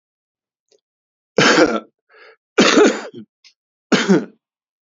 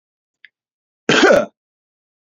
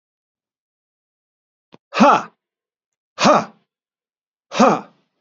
{"three_cough_length": "4.9 s", "three_cough_amplitude": 30421, "three_cough_signal_mean_std_ratio": 0.38, "cough_length": "2.2 s", "cough_amplitude": 32518, "cough_signal_mean_std_ratio": 0.33, "exhalation_length": "5.2 s", "exhalation_amplitude": 31498, "exhalation_signal_mean_std_ratio": 0.29, "survey_phase": "beta (2021-08-13 to 2022-03-07)", "age": "45-64", "gender": "Male", "wearing_mask": "No", "symptom_cough_any": true, "symptom_runny_or_blocked_nose": true, "symptom_sore_throat": true, "symptom_onset": "2 days", "smoker_status": "Never smoked", "respiratory_condition_asthma": false, "respiratory_condition_other": false, "recruitment_source": "Test and Trace", "submission_delay": "2 days", "covid_test_result": "Positive", "covid_test_method": "RT-qPCR", "covid_ct_value": 19.1, "covid_ct_gene": "ORF1ab gene", "covid_ct_mean": 20.1, "covid_viral_load": "260000 copies/ml", "covid_viral_load_category": "Low viral load (10K-1M copies/ml)"}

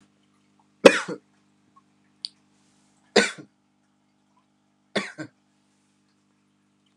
{"cough_length": "7.0 s", "cough_amplitude": 32768, "cough_signal_mean_std_ratio": 0.16, "survey_phase": "alpha (2021-03-01 to 2021-08-12)", "age": "18-44", "gender": "Male", "wearing_mask": "No", "symptom_none": true, "smoker_status": "Never smoked", "respiratory_condition_asthma": false, "respiratory_condition_other": false, "recruitment_source": "REACT", "submission_delay": "3 days", "covid_test_result": "Negative", "covid_test_method": "RT-qPCR"}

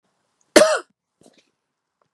{"cough_length": "2.1 s", "cough_amplitude": 32768, "cough_signal_mean_std_ratio": 0.24, "survey_phase": "beta (2021-08-13 to 2022-03-07)", "age": "45-64", "gender": "Female", "wearing_mask": "No", "symptom_fatigue": true, "smoker_status": "Ex-smoker", "respiratory_condition_asthma": false, "respiratory_condition_other": false, "recruitment_source": "REACT", "submission_delay": "4 days", "covid_test_result": "Negative", "covid_test_method": "RT-qPCR", "influenza_a_test_result": "Unknown/Void", "influenza_b_test_result": "Unknown/Void"}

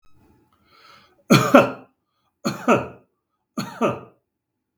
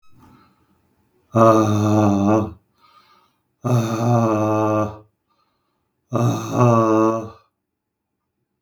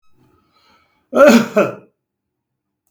{"three_cough_length": "4.8 s", "three_cough_amplitude": 32768, "three_cough_signal_mean_std_ratio": 0.3, "exhalation_length": "8.6 s", "exhalation_amplitude": 32768, "exhalation_signal_mean_std_ratio": 0.54, "cough_length": "2.9 s", "cough_amplitude": 32768, "cough_signal_mean_std_ratio": 0.32, "survey_phase": "beta (2021-08-13 to 2022-03-07)", "age": "65+", "gender": "Male", "wearing_mask": "No", "symptom_none": true, "smoker_status": "Ex-smoker", "respiratory_condition_asthma": false, "respiratory_condition_other": false, "recruitment_source": "REACT", "submission_delay": "2 days", "covid_test_result": "Negative", "covid_test_method": "RT-qPCR"}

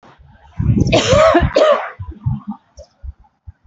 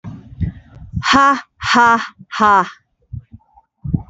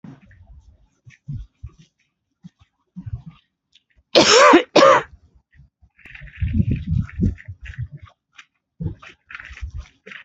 {"three_cough_length": "3.7 s", "three_cough_amplitude": 29132, "three_cough_signal_mean_std_ratio": 0.55, "exhalation_length": "4.1 s", "exhalation_amplitude": 30819, "exhalation_signal_mean_std_ratio": 0.49, "cough_length": "10.2 s", "cough_amplitude": 32768, "cough_signal_mean_std_ratio": 0.33, "survey_phase": "alpha (2021-03-01 to 2021-08-12)", "age": "45-64", "gender": "Female", "wearing_mask": "Yes", "symptom_none": true, "smoker_status": "Ex-smoker", "respiratory_condition_asthma": false, "respiratory_condition_other": false, "recruitment_source": "REACT", "submission_delay": "3 days", "covid_test_result": "Negative", "covid_test_method": "RT-qPCR"}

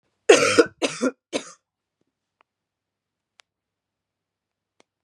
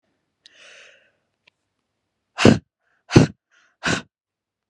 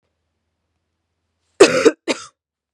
{"three_cough_length": "5.0 s", "three_cough_amplitude": 30779, "three_cough_signal_mean_std_ratio": 0.23, "exhalation_length": "4.7 s", "exhalation_amplitude": 32768, "exhalation_signal_mean_std_ratio": 0.21, "cough_length": "2.7 s", "cough_amplitude": 32768, "cough_signal_mean_std_ratio": 0.25, "survey_phase": "beta (2021-08-13 to 2022-03-07)", "age": "18-44", "gender": "Female", "wearing_mask": "No", "symptom_sore_throat": true, "smoker_status": "Never smoked", "respiratory_condition_asthma": false, "respiratory_condition_other": false, "recruitment_source": "Test and Trace", "submission_delay": "1 day", "covid_test_result": "Positive", "covid_test_method": "LFT"}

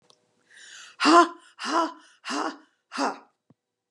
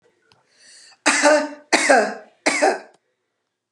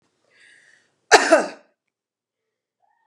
{"exhalation_length": "3.9 s", "exhalation_amplitude": 23652, "exhalation_signal_mean_std_ratio": 0.35, "three_cough_length": "3.7 s", "three_cough_amplitude": 31757, "three_cough_signal_mean_std_ratio": 0.45, "cough_length": "3.1 s", "cough_amplitude": 32768, "cough_signal_mean_std_ratio": 0.23, "survey_phase": "beta (2021-08-13 to 2022-03-07)", "age": "65+", "gender": "Female", "wearing_mask": "No", "symptom_none": true, "symptom_onset": "3 days", "smoker_status": "Never smoked", "respiratory_condition_asthma": true, "respiratory_condition_other": false, "recruitment_source": "REACT", "submission_delay": "2 days", "covid_test_result": "Negative", "covid_test_method": "RT-qPCR", "influenza_a_test_result": "Negative", "influenza_b_test_result": "Negative"}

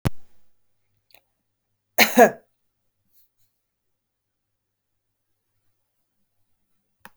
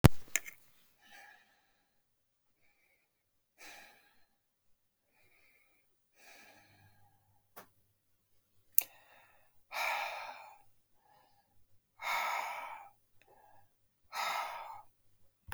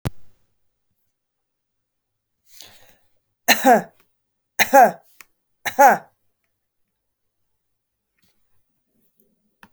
{"cough_length": "7.2 s", "cough_amplitude": 29526, "cough_signal_mean_std_ratio": 0.17, "exhalation_length": "15.5 s", "exhalation_amplitude": 24032, "exhalation_signal_mean_std_ratio": 0.23, "three_cough_length": "9.7 s", "three_cough_amplitude": 32768, "three_cough_signal_mean_std_ratio": 0.23, "survey_phase": "beta (2021-08-13 to 2022-03-07)", "age": "45-64", "gender": "Female", "wearing_mask": "No", "symptom_fatigue": true, "symptom_other": true, "smoker_status": "Never smoked", "respiratory_condition_asthma": false, "respiratory_condition_other": false, "recruitment_source": "Test and Trace", "submission_delay": "2 days", "covid_test_result": "Positive", "covid_test_method": "RT-qPCR", "covid_ct_value": 23.6, "covid_ct_gene": "ORF1ab gene", "covid_ct_mean": 24.2, "covid_viral_load": "12000 copies/ml", "covid_viral_load_category": "Low viral load (10K-1M copies/ml)"}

